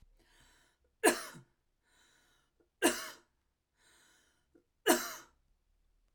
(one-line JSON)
{"three_cough_length": "6.1 s", "three_cough_amplitude": 8441, "three_cough_signal_mean_std_ratio": 0.23, "survey_phase": "alpha (2021-03-01 to 2021-08-12)", "age": "18-44", "gender": "Female", "wearing_mask": "No", "symptom_none": true, "smoker_status": "Never smoked", "respiratory_condition_asthma": true, "respiratory_condition_other": false, "recruitment_source": "REACT", "submission_delay": "1 day", "covid_test_result": "Negative", "covid_test_method": "RT-qPCR"}